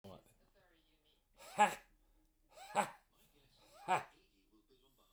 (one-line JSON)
{"exhalation_length": "5.1 s", "exhalation_amplitude": 4061, "exhalation_signal_mean_std_ratio": 0.25, "survey_phase": "beta (2021-08-13 to 2022-03-07)", "age": "45-64", "gender": "Male", "wearing_mask": "No", "symptom_none": true, "smoker_status": "Never smoked", "respiratory_condition_asthma": false, "respiratory_condition_other": false, "recruitment_source": "REACT", "submission_delay": "9 days", "covid_test_result": "Negative", "covid_test_method": "RT-qPCR", "influenza_a_test_result": "Negative", "influenza_b_test_result": "Negative"}